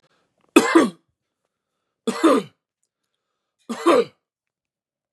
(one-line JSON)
{"three_cough_length": "5.1 s", "three_cough_amplitude": 32768, "three_cough_signal_mean_std_ratio": 0.31, "survey_phase": "beta (2021-08-13 to 2022-03-07)", "age": "45-64", "gender": "Male", "wearing_mask": "No", "symptom_none": true, "smoker_status": "Never smoked", "respiratory_condition_asthma": false, "respiratory_condition_other": false, "recruitment_source": "REACT", "submission_delay": "0 days", "covid_test_result": "Negative", "covid_test_method": "RT-qPCR", "influenza_a_test_result": "Negative", "influenza_b_test_result": "Negative"}